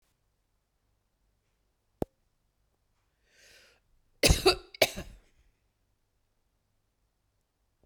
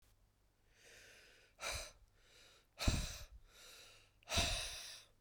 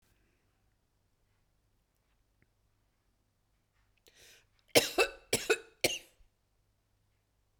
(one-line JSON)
{"cough_length": "7.9 s", "cough_amplitude": 15822, "cough_signal_mean_std_ratio": 0.17, "exhalation_length": "5.2 s", "exhalation_amplitude": 3295, "exhalation_signal_mean_std_ratio": 0.41, "three_cough_length": "7.6 s", "three_cough_amplitude": 11819, "three_cough_signal_mean_std_ratio": 0.19, "survey_phase": "beta (2021-08-13 to 2022-03-07)", "age": "45-64", "gender": "Female", "wearing_mask": "No", "symptom_new_continuous_cough": true, "symptom_runny_or_blocked_nose": true, "symptom_abdominal_pain": true, "symptom_fatigue": true, "symptom_fever_high_temperature": true, "symptom_headache": true, "symptom_change_to_sense_of_smell_or_taste": true, "smoker_status": "Never smoked", "respiratory_condition_asthma": false, "respiratory_condition_other": false, "recruitment_source": "Test and Trace", "submission_delay": "2 days", "covid_test_result": "Positive", "covid_test_method": "RT-qPCR", "covid_ct_value": 25.6, "covid_ct_gene": "ORF1ab gene", "covid_ct_mean": 26.6, "covid_viral_load": "1900 copies/ml", "covid_viral_load_category": "Minimal viral load (< 10K copies/ml)"}